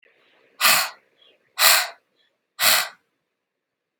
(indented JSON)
{
  "exhalation_length": "4.0 s",
  "exhalation_amplitude": 32767,
  "exhalation_signal_mean_std_ratio": 0.35,
  "survey_phase": "beta (2021-08-13 to 2022-03-07)",
  "age": "18-44",
  "gender": "Female",
  "wearing_mask": "No",
  "symptom_cough_any": true,
  "symptom_runny_or_blocked_nose": true,
  "symptom_diarrhoea": true,
  "symptom_onset": "3 days",
  "smoker_status": "Never smoked",
  "respiratory_condition_asthma": false,
  "respiratory_condition_other": false,
  "recruitment_source": "Test and Trace",
  "submission_delay": "1 day",
  "covid_test_result": "Positive",
  "covid_test_method": "RT-qPCR",
  "covid_ct_value": 22.5,
  "covid_ct_gene": "ORF1ab gene"
}